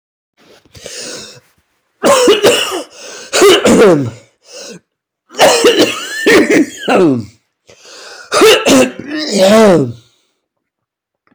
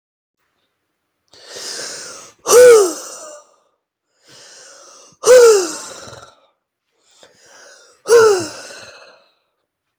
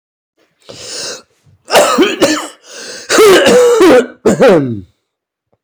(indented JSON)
{
  "three_cough_length": "11.3 s",
  "three_cough_amplitude": 32768,
  "three_cough_signal_mean_std_ratio": 0.59,
  "exhalation_length": "10.0 s",
  "exhalation_amplitude": 32767,
  "exhalation_signal_mean_std_ratio": 0.33,
  "cough_length": "5.6 s",
  "cough_amplitude": 32768,
  "cough_signal_mean_std_ratio": 0.62,
  "survey_phase": "beta (2021-08-13 to 2022-03-07)",
  "age": "45-64",
  "gender": "Male",
  "wearing_mask": "No",
  "symptom_cough_any": true,
  "symptom_runny_or_blocked_nose": true,
  "symptom_shortness_of_breath": true,
  "symptom_onset": "1 day",
  "smoker_status": "Never smoked",
  "respiratory_condition_asthma": true,
  "respiratory_condition_other": false,
  "recruitment_source": "Test and Trace",
  "submission_delay": "0 days",
  "covid_test_result": "Positive",
  "covid_test_method": "RT-qPCR",
  "covid_ct_value": 16.6,
  "covid_ct_gene": "ORF1ab gene",
  "covid_ct_mean": 17.0,
  "covid_viral_load": "2700000 copies/ml",
  "covid_viral_load_category": "High viral load (>1M copies/ml)"
}